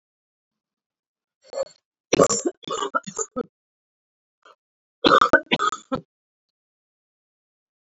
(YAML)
cough_length: 7.9 s
cough_amplitude: 27081
cough_signal_mean_std_ratio: 0.27
survey_phase: beta (2021-08-13 to 2022-03-07)
age: 18-44
gender: Female
wearing_mask: 'No'
symptom_cough_any: true
symptom_runny_or_blocked_nose: true
symptom_fatigue: true
symptom_fever_high_temperature: true
symptom_headache: true
symptom_change_to_sense_of_smell_or_taste: true
symptom_loss_of_taste: true
smoker_status: Never smoked
respiratory_condition_asthma: false
respiratory_condition_other: false
recruitment_source: Test and Trace
submission_delay: 1 day
covid_test_result: Positive
covid_test_method: LFT